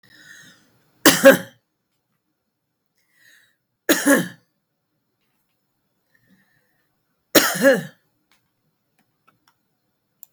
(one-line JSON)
{"three_cough_length": "10.3 s", "three_cough_amplitude": 32768, "three_cough_signal_mean_std_ratio": 0.23, "survey_phase": "beta (2021-08-13 to 2022-03-07)", "age": "45-64", "gender": "Female", "wearing_mask": "No", "symptom_runny_or_blocked_nose": true, "smoker_status": "Never smoked", "respiratory_condition_asthma": false, "respiratory_condition_other": false, "recruitment_source": "REACT", "submission_delay": "1 day", "covid_test_result": "Negative", "covid_test_method": "RT-qPCR", "influenza_a_test_result": "Negative", "influenza_b_test_result": "Negative"}